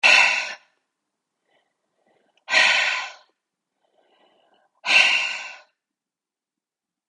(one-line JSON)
{"exhalation_length": "7.1 s", "exhalation_amplitude": 25016, "exhalation_signal_mean_std_ratio": 0.36, "survey_phase": "beta (2021-08-13 to 2022-03-07)", "age": "18-44", "gender": "Female", "wearing_mask": "No", "symptom_cough_any": true, "symptom_fever_high_temperature": true, "symptom_headache": true, "symptom_change_to_sense_of_smell_or_taste": true, "smoker_status": "Ex-smoker", "respiratory_condition_asthma": false, "respiratory_condition_other": false, "recruitment_source": "Test and Trace", "submission_delay": "2 days", "covid_test_result": "Positive", "covid_test_method": "RT-qPCR"}